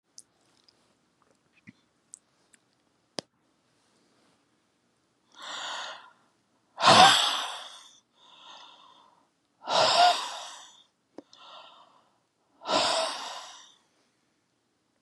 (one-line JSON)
{"exhalation_length": "15.0 s", "exhalation_amplitude": 21910, "exhalation_signal_mean_std_ratio": 0.28, "survey_phase": "beta (2021-08-13 to 2022-03-07)", "age": "65+", "gender": "Male", "wearing_mask": "No", "symptom_cough_any": true, "smoker_status": "Never smoked", "respiratory_condition_asthma": false, "respiratory_condition_other": false, "recruitment_source": "REACT", "submission_delay": "2 days", "covid_test_result": "Negative", "covid_test_method": "RT-qPCR", "influenza_a_test_result": "Negative", "influenza_b_test_result": "Negative"}